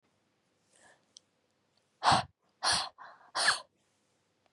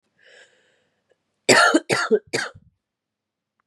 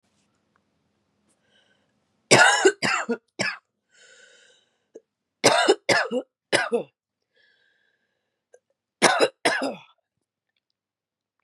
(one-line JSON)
{"exhalation_length": "4.5 s", "exhalation_amplitude": 8327, "exhalation_signal_mean_std_ratio": 0.3, "cough_length": "3.7 s", "cough_amplitude": 27826, "cough_signal_mean_std_ratio": 0.33, "three_cough_length": "11.4 s", "three_cough_amplitude": 29272, "three_cough_signal_mean_std_ratio": 0.32, "survey_phase": "beta (2021-08-13 to 2022-03-07)", "age": "18-44", "gender": "Female", "wearing_mask": "No", "symptom_cough_any": true, "symptom_runny_or_blocked_nose": true, "symptom_shortness_of_breath": true, "symptom_sore_throat": true, "symptom_fatigue": true, "symptom_headache": true, "symptom_change_to_sense_of_smell_or_taste": true, "smoker_status": "Never smoked", "respiratory_condition_asthma": false, "respiratory_condition_other": false, "recruitment_source": "Test and Trace", "submission_delay": "1 day", "covid_test_result": "Positive", "covid_test_method": "LFT"}